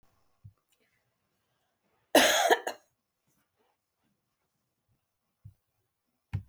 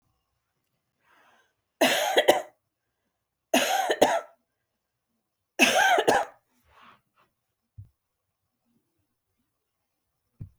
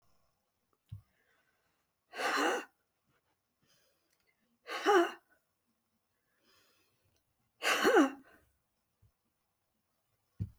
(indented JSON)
{
  "cough_length": "6.5 s",
  "cough_amplitude": 16359,
  "cough_signal_mean_std_ratio": 0.22,
  "three_cough_length": "10.6 s",
  "three_cough_amplitude": 22641,
  "three_cough_signal_mean_std_ratio": 0.32,
  "exhalation_length": "10.6 s",
  "exhalation_amplitude": 5765,
  "exhalation_signal_mean_std_ratio": 0.27,
  "survey_phase": "beta (2021-08-13 to 2022-03-07)",
  "age": "65+",
  "gender": "Female",
  "wearing_mask": "No",
  "symptom_cough_any": true,
  "symptom_shortness_of_breath": true,
  "symptom_fatigue": true,
  "symptom_change_to_sense_of_smell_or_taste": true,
  "smoker_status": "Never smoked",
  "respiratory_condition_asthma": true,
  "respiratory_condition_other": false,
  "recruitment_source": "Test and Trace",
  "submission_delay": "3 days",
  "covid_test_result": "Negative",
  "covid_test_method": "RT-qPCR"
}